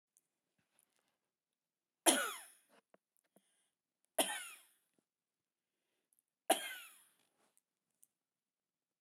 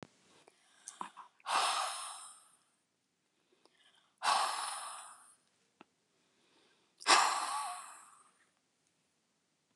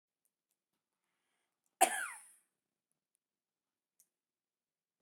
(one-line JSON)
{"three_cough_length": "9.0 s", "three_cough_amplitude": 8107, "three_cough_signal_mean_std_ratio": 0.19, "exhalation_length": "9.8 s", "exhalation_amplitude": 7848, "exhalation_signal_mean_std_ratio": 0.35, "cough_length": "5.0 s", "cough_amplitude": 7362, "cough_signal_mean_std_ratio": 0.15, "survey_phase": "beta (2021-08-13 to 2022-03-07)", "age": "65+", "gender": "Female", "wearing_mask": "No", "symptom_none": true, "symptom_onset": "13 days", "smoker_status": "Never smoked", "respiratory_condition_asthma": false, "respiratory_condition_other": false, "recruitment_source": "REACT", "submission_delay": "1 day", "covid_test_result": "Negative", "covid_test_method": "RT-qPCR", "influenza_a_test_result": "Unknown/Void", "influenza_b_test_result": "Unknown/Void"}